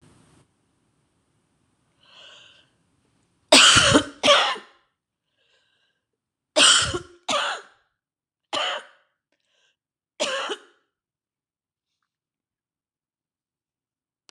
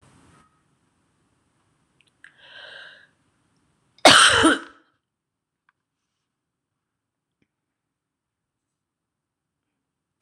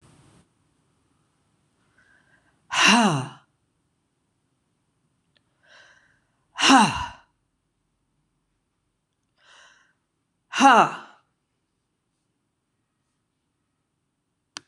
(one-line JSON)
{"three_cough_length": "14.3 s", "three_cough_amplitude": 26027, "three_cough_signal_mean_std_ratio": 0.27, "cough_length": "10.2 s", "cough_amplitude": 26028, "cough_signal_mean_std_ratio": 0.18, "exhalation_length": "14.7 s", "exhalation_amplitude": 25176, "exhalation_signal_mean_std_ratio": 0.23, "survey_phase": "beta (2021-08-13 to 2022-03-07)", "age": "65+", "gender": "Female", "wearing_mask": "No", "symptom_cough_any": true, "symptom_runny_or_blocked_nose": true, "symptom_fatigue": true, "symptom_headache": true, "symptom_change_to_sense_of_smell_or_taste": true, "symptom_loss_of_taste": true, "smoker_status": "Never smoked", "respiratory_condition_asthma": false, "respiratory_condition_other": false, "recruitment_source": "Test and Trace", "submission_delay": "3 days", "covid_test_result": "Positive", "covid_test_method": "RT-qPCR", "covid_ct_value": 16.3, "covid_ct_gene": "ORF1ab gene", "covid_ct_mean": 16.8, "covid_viral_load": "3000000 copies/ml", "covid_viral_load_category": "High viral load (>1M copies/ml)"}